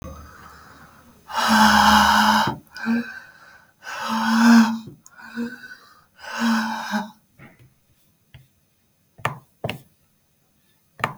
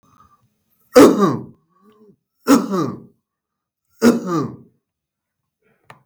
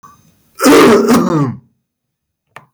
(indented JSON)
{
  "exhalation_length": "11.2 s",
  "exhalation_amplitude": 27911,
  "exhalation_signal_mean_std_ratio": 0.45,
  "three_cough_length": "6.1 s",
  "three_cough_amplitude": 32768,
  "three_cough_signal_mean_std_ratio": 0.32,
  "cough_length": "2.7 s",
  "cough_amplitude": 32768,
  "cough_signal_mean_std_ratio": 0.54,
  "survey_phase": "beta (2021-08-13 to 2022-03-07)",
  "age": "45-64",
  "gender": "Male",
  "wearing_mask": "No",
  "symptom_none": true,
  "smoker_status": "Never smoked",
  "respiratory_condition_asthma": false,
  "respiratory_condition_other": true,
  "recruitment_source": "REACT",
  "submission_delay": "3 days",
  "covid_test_result": "Negative",
  "covid_test_method": "RT-qPCR"
}